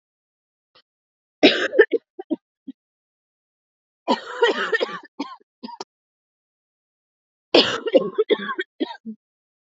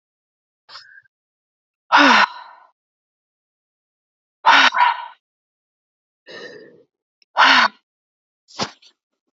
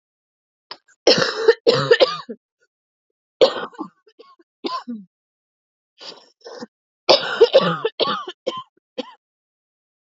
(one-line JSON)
{"cough_length": "9.6 s", "cough_amplitude": 32722, "cough_signal_mean_std_ratio": 0.31, "exhalation_length": "9.4 s", "exhalation_amplitude": 28976, "exhalation_signal_mean_std_ratio": 0.3, "three_cough_length": "10.2 s", "three_cough_amplitude": 31461, "three_cough_signal_mean_std_ratio": 0.34, "survey_phase": "alpha (2021-03-01 to 2021-08-12)", "age": "18-44", "gender": "Female", "wearing_mask": "No", "symptom_cough_any": true, "symptom_shortness_of_breath": true, "symptom_headache": true, "symptom_change_to_sense_of_smell_or_taste": true, "symptom_loss_of_taste": true, "symptom_onset": "7 days", "smoker_status": "Ex-smoker", "respiratory_condition_asthma": false, "respiratory_condition_other": false, "recruitment_source": "Test and Trace", "submission_delay": "2 days", "covid_test_result": "Positive", "covid_test_method": "RT-qPCR", "covid_ct_value": 14.1, "covid_ct_gene": "N gene", "covid_ct_mean": 14.7, "covid_viral_load": "15000000 copies/ml", "covid_viral_load_category": "High viral load (>1M copies/ml)"}